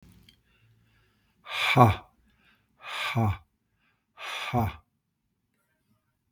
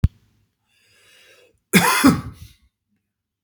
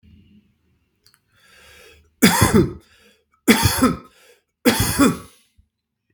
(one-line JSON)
{"exhalation_length": "6.3 s", "exhalation_amplitude": 21962, "exhalation_signal_mean_std_ratio": 0.32, "cough_length": "3.4 s", "cough_amplitude": 32768, "cough_signal_mean_std_ratio": 0.3, "three_cough_length": "6.1 s", "three_cough_amplitude": 32767, "three_cough_signal_mean_std_ratio": 0.38, "survey_phase": "beta (2021-08-13 to 2022-03-07)", "age": "45-64", "gender": "Male", "wearing_mask": "No", "symptom_none": true, "smoker_status": "Ex-smoker", "respiratory_condition_asthma": false, "respiratory_condition_other": false, "recruitment_source": "REACT", "submission_delay": "4 days", "covid_test_result": "Negative", "covid_test_method": "RT-qPCR", "covid_ct_value": 39.0, "covid_ct_gene": "N gene", "influenza_a_test_result": "Negative", "influenza_b_test_result": "Negative"}